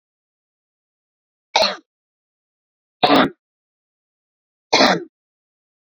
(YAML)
three_cough_length: 5.9 s
three_cough_amplitude: 31007
three_cough_signal_mean_std_ratio: 0.27
survey_phase: beta (2021-08-13 to 2022-03-07)
age: 45-64
gender: Female
wearing_mask: 'No'
symptom_cough_any: true
symptom_onset: 12 days
smoker_status: Never smoked
respiratory_condition_asthma: false
respiratory_condition_other: false
recruitment_source: REACT
submission_delay: 2 days
covid_test_result: Negative
covid_test_method: RT-qPCR